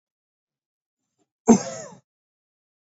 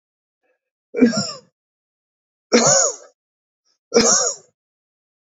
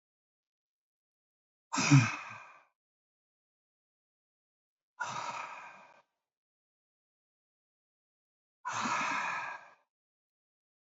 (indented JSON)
{
  "cough_length": "2.8 s",
  "cough_amplitude": 25667,
  "cough_signal_mean_std_ratio": 0.18,
  "three_cough_length": "5.4 s",
  "three_cough_amplitude": 28516,
  "three_cough_signal_mean_std_ratio": 0.36,
  "exhalation_length": "10.9 s",
  "exhalation_amplitude": 8732,
  "exhalation_signal_mean_std_ratio": 0.26,
  "survey_phase": "beta (2021-08-13 to 2022-03-07)",
  "age": "18-44",
  "gender": "Male",
  "wearing_mask": "No",
  "symptom_none": true,
  "smoker_status": "Never smoked",
  "respiratory_condition_asthma": false,
  "respiratory_condition_other": false,
  "recruitment_source": "REACT",
  "submission_delay": "1 day",
  "covid_test_result": "Negative",
  "covid_test_method": "RT-qPCR",
  "influenza_a_test_result": "Negative",
  "influenza_b_test_result": "Negative"
}